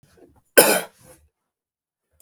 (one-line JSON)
{"cough_length": "2.2 s", "cough_amplitude": 32768, "cough_signal_mean_std_ratio": 0.24, "survey_phase": "beta (2021-08-13 to 2022-03-07)", "age": "45-64", "gender": "Male", "wearing_mask": "No", "symptom_none": true, "smoker_status": "Never smoked", "respiratory_condition_asthma": false, "respiratory_condition_other": false, "recruitment_source": "REACT", "submission_delay": "1 day", "covid_test_result": "Negative", "covid_test_method": "RT-qPCR"}